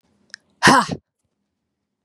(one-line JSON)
{"exhalation_length": "2.0 s", "exhalation_amplitude": 32767, "exhalation_signal_mean_std_ratio": 0.28, "survey_phase": "beta (2021-08-13 to 2022-03-07)", "age": "18-44", "gender": "Female", "wearing_mask": "No", "symptom_cough_any": true, "symptom_runny_or_blocked_nose": true, "symptom_fatigue": true, "symptom_fever_high_temperature": true, "symptom_headache": true, "symptom_other": true, "symptom_onset": "4 days", "smoker_status": "Never smoked", "respiratory_condition_asthma": true, "respiratory_condition_other": false, "recruitment_source": "Test and Trace", "submission_delay": "2 days", "covid_test_result": "Positive", "covid_test_method": "RT-qPCR", "covid_ct_value": 21.2, "covid_ct_gene": "ORF1ab gene"}